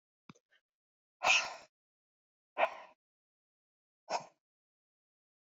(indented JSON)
{
  "exhalation_length": "5.5 s",
  "exhalation_amplitude": 5365,
  "exhalation_signal_mean_std_ratio": 0.23,
  "survey_phase": "beta (2021-08-13 to 2022-03-07)",
  "age": "65+",
  "gender": "Female",
  "wearing_mask": "No",
  "symptom_none": true,
  "smoker_status": "Ex-smoker",
  "respiratory_condition_asthma": false,
  "respiratory_condition_other": false,
  "recruitment_source": "REACT",
  "submission_delay": "1 day",
  "covid_test_result": "Negative",
  "covid_test_method": "RT-qPCR"
}